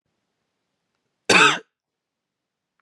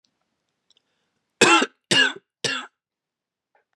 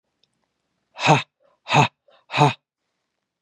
{
  "cough_length": "2.8 s",
  "cough_amplitude": 29834,
  "cough_signal_mean_std_ratio": 0.24,
  "three_cough_length": "3.8 s",
  "three_cough_amplitude": 29340,
  "three_cough_signal_mean_std_ratio": 0.3,
  "exhalation_length": "3.4 s",
  "exhalation_amplitude": 28665,
  "exhalation_signal_mean_std_ratio": 0.3,
  "survey_phase": "beta (2021-08-13 to 2022-03-07)",
  "age": "18-44",
  "gender": "Male",
  "wearing_mask": "No",
  "symptom_none": true,
  "symptom_onset": "12 days",
  "smoker_status": "Never smoked",
  "respiratory_condition_asthma": false,
  "respiratory_condition_other": false,
  "recruitment_source": "REACT",
  "submission_delay": "1 day",
  "covid_test_result": "Negative",
  "covid_test_method": "RT-qPCR",
  "influenza_a_test_result": "Negative",
  "influenza_b_test_result": "Negative"
}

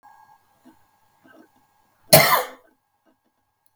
{
  "cough_length": "3.8 s",
  "cough_amplitude": 32768,
  "cough_signal_mean_std_ratio": 0.22,
  "survey_phase": "beta (2021-08-13 to 2022-03-07)",
  "age": "65+",
  "gender": "Male",
  "wearing_mask": "No",
  "symptom_none": true,
  "smoker_status": "Never smoked",
  "respiratory_condition_asthma": true,
  "respiratory_condition_other": false,
  "recruitment_source": "REACT",
  "submission_delay": "2 days",
  "covid_test_result": "Negative",
  "covid_test_method": "RT-qPCR",
  "influenza_a_test_result": "Negative",
  "influenza_b_test_result": "Negative"
}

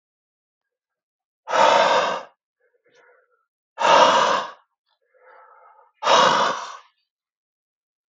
{
  "exhalation_length": "8.1 s",
  "exhalation_amplitude": 27121,
  "exhalation_signal_mean_std_ratio": 0.4,
  "survey_phase": "beta (2021-08-13 to 2022-03-07)",
  "age": "18-44",
  "gender": "Male",
  "wearing_mask": "No",
  "symptom_none": true,
  "smoker_status": "Ex-smoker",
  "respiratory_condition_asthma": false,
  "respiratory_condition_other": false,
  "recruitment_source": "REACT",
  "submission_delay": "3 days",
  "covid_test_result": "Negative",
  "covid_test_method": "RT-qPCR",
  "influenza_a_test_result": "Negative",
  "influenza_b_test_result": "Negative"
}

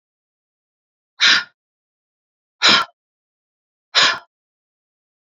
{
  "exhalation_length": "5.4 s",
  "exhalation_amplitude": 32101,
  "exhalation_signal_mean_std_ratio": 0.27,
  "survey_phase": "beta (2021-08-13 to 2022-03-07)",
  "age": "45-64",
  "gender": "Female",
  "wearing_mask": "No",
  "symptom_shortness_of_breath": true,
  "symptom_fatigue": true,
  "smoker_status": "Never smoked",
  "respiratory_condition_asthma": false,
  "respiratory_condition_other": false,
  "recruitment_source": "REACT",
  "submission_delay": "2 days",
  "covid_test_result": "Negative",
  "covid_test_method": "RT-qPCR"
}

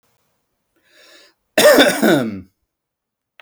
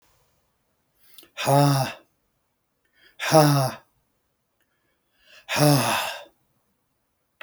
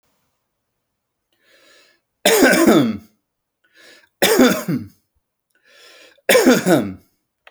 {
  "cough_length": "3.4 s",
  "cough_amplitude": 31989,
  "cough_signal_mean_std_ratio": 0.37,
  "exhalation_length": "7.4 s",
  "exhalation_amplitude": 28345,
  "exhalation_signal_mean_std_ratio": 0.36,
  "three_cough_length": "7.5 s",
  "three_cough_amplitude": 30520,
  "three_cough_signal_mean_std_ratio": 0.4,
  "survey_phase": "beta (2021-08-13 to 2022-03-07)",
  "age": "45-64",
  "gender": "Male",
  "wearing_mask": "No",
  "symptom_runny_or_blocked_nose": true,
  "smoker_status": "Never smoked",
  "respiratory_condition_asthma": false,
  "respiratory_condition_other": false,
  "recruitment_source": "REACT",
  "submission_delay": "1 day",
  "covid_test_result": "Negative",
  "covid_test_method": "RT-qPCR"
}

